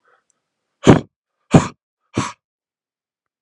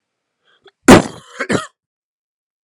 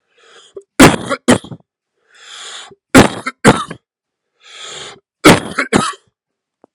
{"exhalation_length": "3.4 s", "exhalation_amplitude": 32768, "exhalation_signal_mean_std_ratio": 0.22, "cough_length": "2.6 s", "cough_amplitude": 32768, "cough_signal_mean_std_ratio": 0.25, "three_cough_length": "6.7 s", "three_cough_amplitude": 32768, "three_cough_signal_mean_std_ratio": 0.33, "survey_phase": "alpha (2021-03-01 to 2021-08-12)", "age": "18-44", "gender": "Male", "wearing_mask": "No", "symptom_none": true, "smoker_status": "Ex-smoker", "respiratory_condition_asthma": false, "respiratory_condition_other": false, "recruitment_source": "Test and Trace", "submission_delay": "0 days", "covid_test_result": "Negative", "covid_test_method": "LFT"}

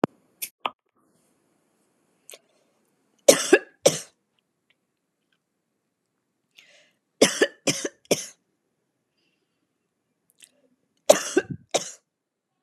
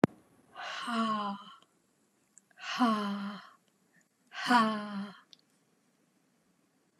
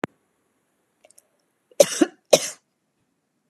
{"three_cough_length": "12.6 s", "three_cough_amplitude": 32768, "three_cough_signal_mean_std_ratio": 0.2, "exhalation_length": "7.0 s", "exhalation_amplitude": 15741, "exhalation_signal_mean_std_ratio": 0.41, "cough_length": "3.5 s", "cough_amplitude": 32768, "cough_signal_mean_std_ratio": 0.18, "survey_phase": "beta (2021-08-13 to 2022-03-07)", "age": "18-44", "gender": "Female", "wearing_mask": "No", "symptom_sore_throat": true, "smoker_status": "Never smoked", "respiratory_condition_asthma": false, "respiratory_condition_other": false, "recruitment_source": "Test and Trace", "submission_delay": "1 day", "covid_test_result": "Negative", "covid_test_method": "RT-qPCR"}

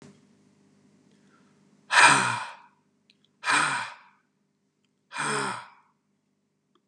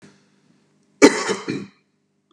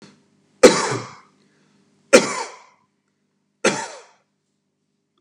{"exhalation_length": "6.9 s", "exhalation_amplitude": 21898, "exhalation_signal_mean_std_ratio": 0.32, "cough_length": "2.3 s", "cough_amplitude": 32768, "cough_signal_mean_std_ratio": 0.27, "three_cough_length": "5.2 s", "three_cough_amplitude": 32768, "three_cough_signal_mean_std_ratio": 0.25, "survey_phase": "beta (2021-08-13 to 2022-03-07)", "age": "45-64", "gender": "Male", "wearing_mask": "No", "symptom_none": true, "smoker_status": "Never smoked", "respiratory_condition_asthma": false, "respiratory_condition_other": false, "recruitment_source": "REACT", "submission_delay": "5 days", "covid_test_result": "Negative", "covid_test_method": "RT-qPCR"}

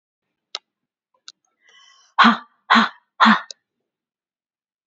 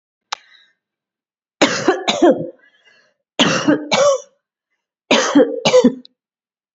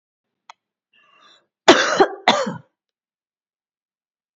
{"exhalation_length": "4.9 s", "exhalation_amplitude": 32767, "exhalation_signal_mean_std_ratio": 0.27, "three_cough_length": "6.7 s", "three_cough_amplitude": 30867, "three_cough_signal_mean_std_ratio": 0.45, "cough_length": "4.4 s", "cough_amplitude": 31603, "cough_signal_mean_std_ratio": 0.27, "survey_phase": "beta (2021-08-13 to 2022-03-07)", "age": "45-64", "gender": "Female", "wearing_mask": "No", "symptom_none": true, "smoker_status": "Never smoked", "respiratory_condition_asthma": false, "respiratory_condition_other": false, "recruitment_source": "REACT", "submission_delay": "2 days", "covid_test_result": "Negative", "covid_test_method": "RT-qPCR"}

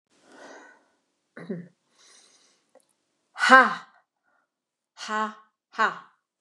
{"exhalation_length": "6.4 s", "exhalation_amplitude": 29203, "exhalation_signal_mean_std_ratio": 0.23, "survey_phase": "beta (2021-08-13 to 2022-03-07)", "age": "65+", "gender": "Female", "wearing_mask": "No", "symptom_runny_or_blocked_nose": true, "symptom_headache": true, "smoker_status": "Never smoked", "respiratory_condition_asthma": false, "respiratory_condition_other": false, "recruitment_source": "Test and Trace", "submission_delay": "2 days", "covid_test_result": "Positive", "covid_test_method": "RT-qPCR"}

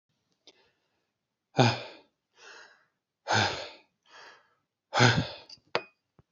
{"exhalation_length": "6.3 s", "exhalation_amplitude": 16499, "exhalation_signal_mean_std_ratio": 0.3, "survey_phase": "beta (2021-08-13 to 2022-03-07)", "age": "45-64", "gender": "Male", "wearing_mask": "No", "symptom_none": true, "smoker_status": "Never smoked", "respiratory_condition_asthma": false, "respiratory_condition_other": false, "recruitment_source": "REACT", "submission_delay": "1 day", "covid_test_result": "Negative", "covid_test_method": "RT-qPCR", "influenza_a_test_result": "Negative", "influenza_b_test_result": "Negative"}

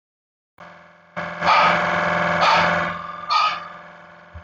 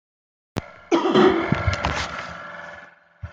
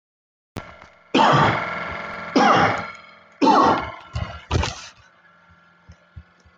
{"exhalation_length": "4.4 s", "exhalation_amplitude": 20652, "exhalation_signal_mean_std_ratio": 0.64, "cough_length": "3.3 s", "cough_amplitude": 19600, "cough_signal_mean_std_ratio": 0.52, "three_cough_length": "6.6 s", "three_cough_amplitude": 20966, "three_cough_signal_mean_std_ratio": 0.49, "survey_phase": "beta (2021-08-13 to 2022-03-07)", "age": "45-64", "gender": "Male", "wearing_mask": "No", "symptom_none": true, "smoker_status": "Ex-smoker", "respiratory_condition_asthma": false, "respiratory_condition_other": false, "recruitment_source": "REACT", "submission_delay": "1 day", "covid_test_result": "Negative", "covid_test_method": "RT-qPCR"}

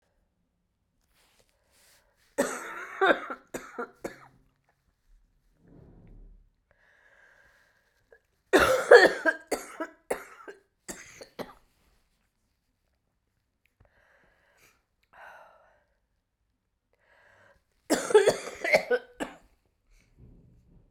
{"three_cough_length": "20.9 s", "three_cough_amplitude": 28297, "three_cough_signal_mean_std_ratio": 0.23, "survey_phase": "beta (2021-08-13 to 2022-03-07)", "age": "45-64", "gender": "Female", "wearing_mask": "No", "symptom_cough_any": true, "symptom_runny_or_blocked_nose": true, "symptom_sore_throat": true, "symptom_fatigue": true, "symptom_fever_high_temperature": true, "symptom_change_to_sense_of_smell_or_taste": true, "symptom_loss_of_taste": true, "symptom_other": true, "symptom_onset": "4 days", "smoker_status": "Ex-smoker", "respiratory_condition_asthma": false, "respiratory_condition_other": false, "recruitment_source": "Test and Trace", "submission_delay": "2 days", "covid_test_result": "Positive", "covid_test_method": "RT-qPCR", "covid_ct_value": 20.7, "covid_ct_gene": "ORF1ab gene", "covid_ct_mean": 21.0, "covid_viral_load": "130000 copies/ml", "covid_viral_load_category": "Low viral load (10K-1M copies/ml)"}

